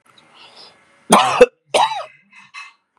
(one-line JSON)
{"cough_length": "3.0 s", "cough_amplitude": 32768, "cough_signal_mean_std_ratio": 0.34, "survey_phase": "beta (2021-08-13 to 2022-03-07)", "age": "45-64", "gender": "Male", "wearing_mask": "No", "symptom_none": true, "smoker_status": "Ex-smoker", "respiratory_condition_asthma": false, "respiratory_condition_other": false, "recruitment_source": "REACT", "submission_delay": "2 days", "covid_test_result": "Negative", "covid_test_method": "RT-qPCR"}